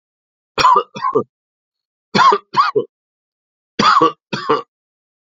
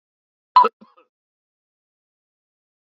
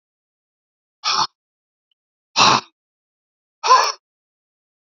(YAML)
three_cough_length: 5.2 s
three_cough_amplitude: 31218
three_cough_signal_mean_std_ratio: 0.42
cough_length: 3.0 s
cough_amplitude: 27492
cough_signal_mean_std_ratio: 0.16
exhalation_length: 4.9 s
exhalation_amplitude: 32070
exhalation_signal_mean_std_ratio: 0.29
survey_phase: beta (2021-08-13 to 2022-03-07)
age: 65+
gender: Male
wearing_mask: 'No'
symptom_none: true
smoker_status: Ex-smoker
respiratory_condition_asthma: false
respiratory_condition_other: false
recruitment_source: REACT
submission_delay: 1 day
covid_test_result: Negative
covid_test_method: RT-qPCR
influenza_a_test_result: Negative
influenza_b_test_result: Negative